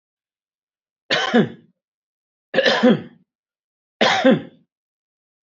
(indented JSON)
{
  "three_cough_length": "5.5 s",
  "three_cough_amplitude": 26892,
  "three_cough_signal_mean_std_ratio": 0.36,
  "survey_phase": "beta (2021-08-13 to 2022-03-07)",
  "age": "65+",
  "gender": "Male",
  "wearing_mask": "No",
  "symptom_none": true,
  "smoker_status": "Never smoked",
  "respiratory_condition_asthma": false,
  "respiratory_condition_other": false,
  "recruitment_source": "REACT",
  "submission_delay": "3 days",
  "covid_test_result": "Negative",
  "covid_test_method": "RT-qPCR"
}